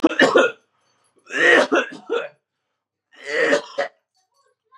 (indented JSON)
{
  "three_cough_length": "4.8 s",
  "three_cough_amplitude": 31138,
  "three_cough_signal_mean_std_ratio": 0.44,
  "survey_phase": "beta (2021-08-13 to 2022-03-07)",
  "age": "18-44",
  "gender": "Male",
  "wearing_mask": "Yes",
  "symptom_cough_any": true,
  "symptom_runny_or_blocked_nose": true,
  "symptom_sore_throat": true,
  "symptom_other": true,
  "symptom_onset": "2 days",
  "smoker_status": "Never smoked",
  "respiratory_condition_asthma": false,
  "respiratory_condition_other": false,
  "recruitment_source": "Test and Trace",
  "submission_delay": "1 day",
  "covid_test_result": "Positive",
  "covid_test_method": "RT-qPCR",
  "covid_ct_value": 20.5,
  "covid_ct_gene": "N gene"
}